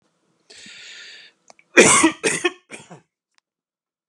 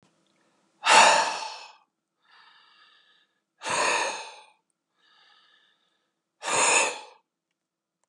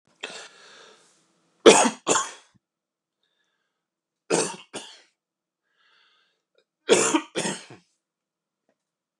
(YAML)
cough_length: 4.1 s
cough_amplitude: 32768
cough_signal_mean_std_ratio: 0.3
exhalation_length: 8.1 s
exhalation_amplitude: 25537
exhalation_signal_mean_std_ratio: 0.34
three_cough_length: 9.2 s
three_cough_amplitude: 32768
three_cough_signal_mean_std_ratio: 0.25
survey_phase: beta (2021-08-13 to 2022-03-07)
age: 45-64
gender: Male
wearing_mask: 'No'
symptom_shortness_of_breath: true
symptom_fatigue: true
symptom_headache: true
symptom_onset: 8 days
smoker_status: Never smoked
respiratory_condition_asthma: true
respiratory_condition_other: false
recruitment_source: REACT
submission_delay: 1 day
covid_test_result: Negative
covid_test_method: RT-qPCR